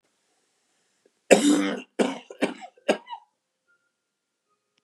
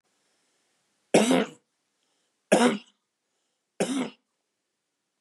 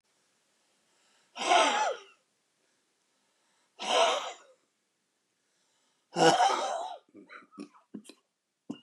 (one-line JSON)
{"cough_length": "4.8 s", "cough_amplitude": 31745, "cough_signal_mean_std_ratio": 0.3, "three_cough_length": "5.2 s", "three_cough_amplitude": 17420, "three_cough_signal_mean_std_ratio": 0.3, "exhalation_length": "8.8 s", "exhalation_amplitude": 10172, "exhalation_signal_mean_std_ratio": 0.36, "survey_phase": "beta (2021-08-13 to 2022-03-07)", "age": "65+", "gender": "Male", "wearing_mask": "No", "symptom_cough_any": true, "smoker_status": "Ex-smoker", "respiratory_condition_asthma": true, "respiratory_condition_other": false, "recruitment_source": "REACT", "submission_delay": "2 days", "covid_test_result": "Negative", "covid_test_method": "RT-qPCR", "influenza_a_test_result": "Negative", "influenza_b_test_result": "Negative"}